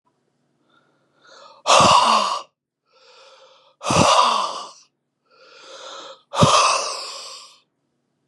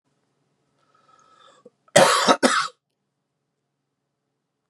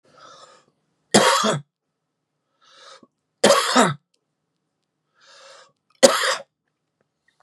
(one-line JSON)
{"exhalation_length": "8.3 s", "exhalation_amplitude": 29214, "exhalation_signal_mean_std_ratio": 0.42, "cough_length": "4.7 s", "cough_amplitude": 32767, "cough_signal_mean_std_ratio": 0.27, "three_cough_length": "7.4 s", "three_cough_amplitude": 32768, "three_cough_signal_mean_std_ratio": 0.31, "survey_phase": "beta (2021-08-13 to 2022-03-07)", "age": "45-64", "gender": "Male", "wearing_mask": "No", "symptom_none": true, "smoker_status": "Never smoked", "respiratory_condition_asthma": false, "respiratory_condition_other": false, "recruitment_source": "REACT", "submission_delay": "3 days", "covid_test_result": "Negative", "covid_test_method": "RT-qPCR", "influenza_a_test_result": "Negative", "influenza_b_test_result": "Negative"}